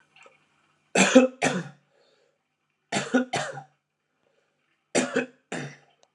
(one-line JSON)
{"three_cough_length": "6.1 s", "three_cough_amplitude": 27572, "three_cough_signal_mean_std_ratio": 0.32, "survey_phase": "beta (2021-08-13 to 2022-03-07)", "age": "45-64", "gender": "Male", "wearing_mask": "No", "symptom_cough_any": true, "symptom_runny_or_blocked_nose": true, "symptom_sore_throat": true, "symptom_fatigue": true, "symptom_headache": true, "symptom_change_to_sense_of_smell_or_taste": true, "symptom_onset": "2 days", "smoker_status": "Never smoked", "respiratory_condition_asthma": false, "respiratory_condition_other": false, "recruitment_source": "Test and Trace", "submission_delay": "1 day", "covid_test_result": "Positive", "covid_test_method": "RT-qPCR", "covid_ct_value": 19.9, "covid_ct_gene": "ORF1ab gene", "covid_ct_mean": 20.8, "covid_viral_load": "150000 copies/ml", "covid_viral_load_category": "Low viral load (10K-1M copies/ml)"}